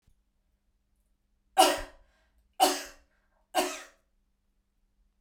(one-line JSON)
{"three_cough_length": "5.2 s", "three_cough_amplitude": 16227, "three_cough_signal_mean_std_ratio": 0.26, "survey_phase": "beta (2021-08-13 to 2022-03-07)", "age": "45-64", "gender": "Female", "wearing_mask": "No", "symptom_none": true, "smoker_status": "Never smoked", "respiratory_condition_asthma": false, "respiratory_condition_other": false, "recruitment_source": "REACT", "submission_delay": "1 day", "covid_test_result": "Negative", "covid_test_method": "RT-qPCR"}